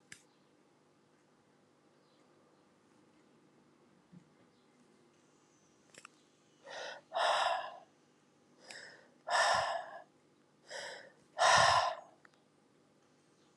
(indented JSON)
{
  "exhalation_length": "13.6 s",
  "exhalation_amplitude": 5852,
  "exhalation_signal_mean_std_ratio": 0.32,
  "survey_phase": "alpha (2021-03-01 to 2021-08-12)",
  "age": "45-64",
  "gender": "Female",
  "wearing_mask": "No",
  "symptom_cough_any": true,
  "symptom_shortness_of_breath": true,
  "symptom_abdominal_pain": true,
  "symptom_fatigue": true,
  "symptom_fever_high_temperature": true,
  "symptom_headache": true,
  "symptom_change_to_sense_of_smell_or_taste": true,
  "symptom_onset": "3 days",
  "smoker_status": "Never smoked",
  "respiratory_condition_asthma": false,
  "respiratory_condition_other": false,
  "recruitment_source": "Test and Trace",
  "submission_delay": "2 days",
  "covid_test_result": "Positive",
  "covid_test_method": "RT-qPCR",
  "covid_ct_value": 16.6,
  "covid_ct_gene": "ORF1ab gene",
  "covid_ct_mean": 16.9,
  "covid_viral_load": "2900000 copies/ml",
  "covid_viral_load_category": "High viral load (>1M copies/ml)"
}